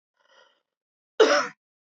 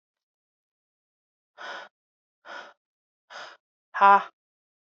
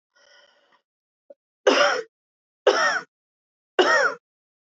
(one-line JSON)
{"cough_length": "1.9 s", "cough_amplitude": 19892, "cough_signal_mean_std_ratio": 0.29, "exhalation_length": "4.9 s", "exhalation_amplitude": 20788, "exhalation_signal_mean_std_ratio": 0.18, "three_cough_length": "4.6 s", "three_cough_amplitude": 23770, "three_cough_signal_mean_std_ratio": 0.38, "survey_phase": "alpha (2021-03-01 to 2021-08-12)", "age": "18-44", "gender": "Female", "wearing_mask": "No", "symptom_none": true, "smoker_status": "Never smoked", "respiratory_condition_asthma": true, "respiratory_condition_other": false, "recruitment_source": "REACT", "submission_delay": "1 day", "covid_test_result": "Negative", "covid_test_method": "RT-qPCR"}